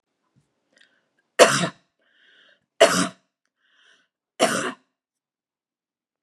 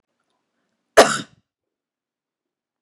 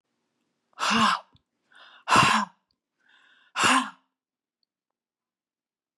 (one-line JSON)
{"three_cough_length": "6.2 s", "three_cough_amplitude": 32754, "three_cough_signal_mean_std_ratio": 0.25, "cough_length": "2.8 s", "cough_amplitude": 32768, "cough_signal_mean_std_ratio": 0.17, "exhalation_length": "6.0 s", "exhalation_amplitude": 18441, "exhalation_signal_mean_std_ratio": 0.34, "survey_phase": "beta (2021-08-13 to 2022-03-07)", "age": "65+", "gender": "Female", "wearing_mask": "No", "symptom_headache": true, "smoker_status": "Ex-smoker", "respiratory_condition_asthma": false, "respiratory_condition_other": false, "recruitment_source": "REACT", "submission_delay": "3 days", "covid_test_result": "Negative", "covid_test_method": "RT-qPCR", "influenza_a_test_result": "Negative", "influenza_b_test_result": "Negative"}